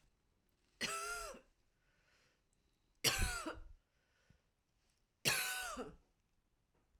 three_cough_length: 7.0 s
three_cough_amplitude: 3742
three_cough_signal_mean_std_ratio: 0.38
survey_phase: alpha (2021-03-01 to 2021-08-12)
age: 45-64
gender: Female
wearing_mask: 'No'
symptom_fatigue: true
symptom_change_to_sense_of_smell_or_taste: true
symptom_loss_of_taste: true
symptom_onset: 2 days
smoker_status: Ex-smoker
respiratory_condition_asthma: false
respiratory_condition_other: false
recruitment_source: Test and Trace
submission_delay: 2 days
covid_test_result: Positive
covid_test_method: RT-qPCR
covid_ct_value: 15.1
covid_ct_gene: ORF1ab gene
covid_ct_mean: 15.6
covid_viral_load: 7400000 copies/ml
covid_viral_load_category: High viral load (>1M copies/ml)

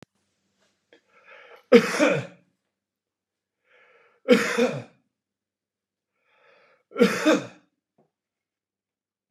three_cough_length: 9.3 s
three_cough_amplitude: 29700
three_cough_signal_mean_std_ratio: 0.27
survey_phase: beta (2021-08-13 to 2022-03-07)
age: 65+
gender: Male
wearing_mask: 'No'
symptom_none: true
smoker_status: Ex-smoker
respiratory_condition_asthma: false
respiratory_condition_other: false
recruitment_source: REACT
submission_delay: 1 day
covid_test_result: Negative
covid_test_method: RT-qPCR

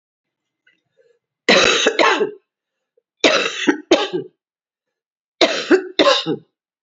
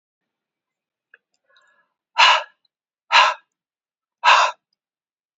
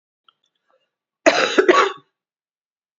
three_cough_length: 6.8 s
three_cough_amplitude: 31627
three_cough_signal_mean_std_ratio: 0.44
exhalation_length: 5.4 s
exhalation_amplitude: 29993
exhalation_signal_mean_std_ratio: 0.29
cough_length: 3.0 s
cough_amplitude: 28580
cough_signal_mean_std_ratio: 0.33
survey_phase: beta (2021-08-13 to 2022-03-07)
age: 65+
gender: Female
wearing_mask: 'No'
symptom_cough_any: true
symptom_new_continuous_cough: true
symptom_runny_or_blocked_nose: true
symptom_onset: 4 days
smoker_status: Never smoked
respiratory_condition_asthma: false
respiratory_condition_other: false
recruitment_source: Test and Trace
submission_delay: 2 days
covid_test_result: Positive
covid_test_method: RT-qPCR
covid_ct_value: 19.6
covid_ct_gene: ORF1ab gene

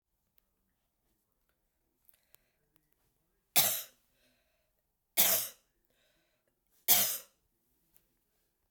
three_cough_length: 8.7 s
three_cough_amplitude: 12639
three_cough_signal_mean_std_ratio: 0.23
survey_phase: beta (2021-08-13 to 2022-03-07)
age: 65+
gender: Female
wearing_mask: 'No'
symptom_none: true
smoker_status: Never smoked
respiratory_condition_asthma: false
respiratory_condition_other: false
recruitment_source: REACT
submission_delay: 0 days
covid_test_result: Negative
covid_test_method: RT-qPCR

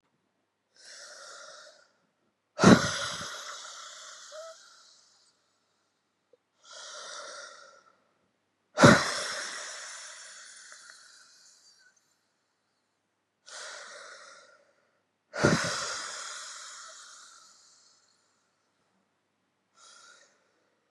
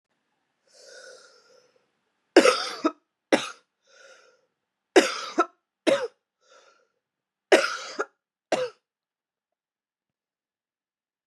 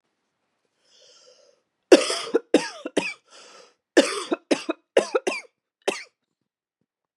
exhalation_length: 20.9 s
exhalation_amplitude: 25119
exhalation_signal_mean_std_ratio: 0.24
three_cough_length: 11.3 s
three_cough_amplitude: 26865
three_cough_signal_mean_std_ratio: 0.25
cough_length: 7.2 s
cough_amplitude: 31318
cough_signal_mean_std_ratio: 0.28
survey_phase: beta (2021-08-13 to 2022-03-07)
age: 18-44
gender: Female
wearing_mask: 'No'
symptom_cough_any: true
symptom_new_continuous_cough: true
symptom_runny_or_blocked_nose: true
symptom_sore_throat: true
symptom_fatigue: true
symptom_fever_high_temperature: true
symptom_headache: true
symptom_change_to_sense_of_smell_or_taste: true
symptom_onset: 5 days
smoker_status: Ex-smoker
respiratory_condition_asthma: false
respiratory_condition_other: false
recruitment_source: Test and Trace
submission_delay: 2 days
covid_test_result: Positive
covid_test_method: ePCR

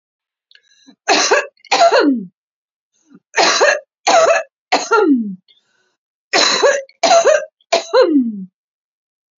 three_cough_length: 9.4 s
three_cough_amplitude: 32768
three_cough_signal_mean_std_ratio: 0.54
survey_phase: beta (2021-08-13 to 2022-03-07)
age: 18-44
gender: Female
wearing_mask: 'No'
symptom_prefer_not_to_say: true
symptom_onset: 9 days
smoker_status: Current smoker (1 to 10 cigarettes per day)
respiratory_condition_asthma: false
respiratory_condition_other: false
recruitment_source: Test and Trace
submission_delay: 2 days
covid_test_result: Positive
covid_test_method: RT-qPCR
covid_ct_value: 28.6
covid_ct_gene: ORF1ab gene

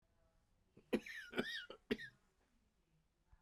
cough_length: 3.4 s
cough_amplitude: 2201
cough_signal_mean_std_ratio: 0.33
survey_phase: beta (2021-08-13 to 2022-03-07)
age: 45-64
gender: Male
wearing_mask: 'No'
symptom_cough_any: true
symptom_new_continuous_cough: true
symptom_runny_or_blocked_nose: true
symptom_shortness_of_breath: true
symptom_sore_throat: true
symptom_diarrhoea: true
symptom_fatigue: true
symptom_headache: true
symptom_onset: 3 days
smoker_status: Ex-smoker
respiratory_condition_asthma: false
respiratory_condition_other: false
recruitment_source: Test and Trace
submission_delay: 1 day
covid_test_result: Positive
covid_test_method: RT-qPCR
covid_ct_value: 15.2
covid_ct_gene: ORF1ab gene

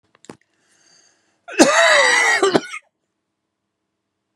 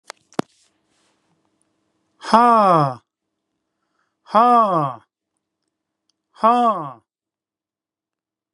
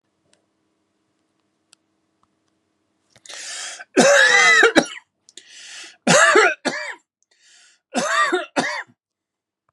cough_length: 4.4 s
cough_amplitude: 32768
cough_signal_mean_std_ratio: 0.41
exhalation_length: 8.5 s
exhalation_amplitude: 32767
exhalation_signal_mean_std_ratio: 0.33
three_cough_length: 9.7 s
three_cough_amplitude: 32768
three_cough_signal_mean_std_ratio: 0.39
survey_phase: beta (2021-08-13 to 2022-03-07)
age: 45-64
gender: Male
wearing_mask: 'No'
symptom_none: true
smoker_status: Ex-smoker
respiratory_condition_asthma: false
respiratory_condition_other: false
recruitment_source: REACT
submission_delay: 2 days
covid_test_result: Negative
covid_test_method: RT-qPCR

